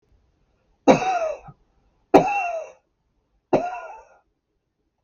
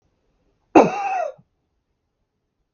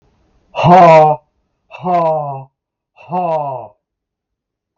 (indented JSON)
{
  "three_cough_length": "5.0 s",
  "three_cough_amplitude": 32768,
  "three_cough_signal_mean_std_ratio": 0.33,
  "cough_length": "2.7 s",
  "cough_amplitude": 32768,
  "cough_signal_mean_std_ratio": 0.27,
  "exhalation_length": "4.8 s",
  "exhalation_amplitude": 32768,
  "exhalation_signal_mean_std_ratio": 0.45,
  "survey_phase": "beta (2021-08-13 to 2022-03-07)",
  "age": "65+",
  "gender": "Male",
  "wearing_mask": "No",
  "symptom_runny_or_blocked_nose": true,
  "symptom_sore_throat": true,
  "smoker_status": "Ex-smoker",
  "respiratory_condition_asthma": false,
  "respiratory_condition_other": false,
  "recruitment_source": "REACT",
  "submission_delay": "3 days",
  "covid_test_result": "Negative",
  "covid_test_method": "RT-qPCR",
  "influenza_a_test_result": "Negative",
  "influenza_b_test_result": "Negative"
}